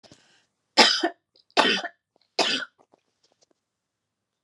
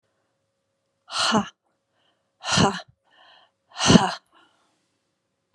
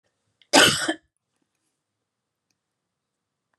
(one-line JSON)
{"three_cough_length": "4.4 s", "three_cough_amplitude": 32767, "three_cough_signal_mean_std_ratio": 0.3, "exhalation_length": "5.5 s", "exhalation_amplitude": 31949, "exhalation_signal_mean_std_ratio": 0.29, "cough_length": "3.6 s", "cough_amplitude": 30744, "cough_signal_mean_std_ratio": 0.23, "survey_phase": "beta (2021-08-13 to 2022-03-07)", "age": "65+", "gender": "Female", "wearing_mask": "No", "symptom_none": true, "smoker_status": "Never smoked", "respiratory_condition_asthma": false, "respiratory_condition_other": false, "recruitment_source": "REACT", "submission_delay": "2 days", "covid_test_result": "Negative", "covid_test_method": "RT-qPCR", "influenza_a_test_result": "Negative", "influenza_b_test_result": "Negative"}